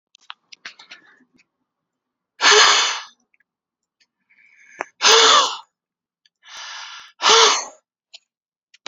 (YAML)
exhalation_length: 8.9 s
exhalation_amplitude: 32767
exhalation_signal_mean_std_ratio: 0.34
survey_phase: beta (2021-08-13 to 2022-03-07)
age: 18-44
gender: Male
wearing_mask: 'No'
symptom_cough_any: true
symptom_shortness_of_breath: true
symptom_fever_high_temperature: true
symptom_change_to_sense_of_smell_or_taste: true
smoker_status: Ex-smoker
respiratory_condition_asthma: true
respiratory_condition_other: false
recruitment_source: Test and Trace
submission_delay: 2 days
covid_test_result: Positive
covid_test_method: LFT